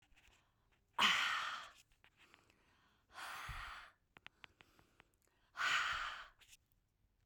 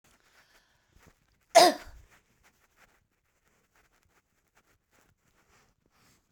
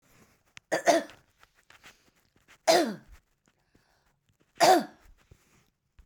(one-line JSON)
{"exhalation_length": "7.3 s", "exhalation_amplitude": 3408, "exhalation_signal_mean_std_ratio": 0.38, "cough_length": "6.3 s", "cough_amplitude": 18911, "cough_signal_mean_std_ratio": 0.14, "three_cough_length": "6.1 s", "three_cough_amplitude": 14096, "three_cough_signal_mean_std_ratio": 0.28, "survey_phase": "beta (2021-08-13 to 2022-03-07)", "age": "45-64", "gender": "Female", "wearing_mask": "No", "symptom_none": true, "smoker_status": "Current smoker (e-cigarettes or vapes only)", "respiratory_condition_asthma": false, "respiratory_condition_other": false, "recruitment_source": "REACT", "submission_delay": "3 days", "covid_test_result": "Negative", "covid_test_method": "RT-qPCR", "influenza_a_test_result": "Negative", "influenza_b_test_result": "Negative"}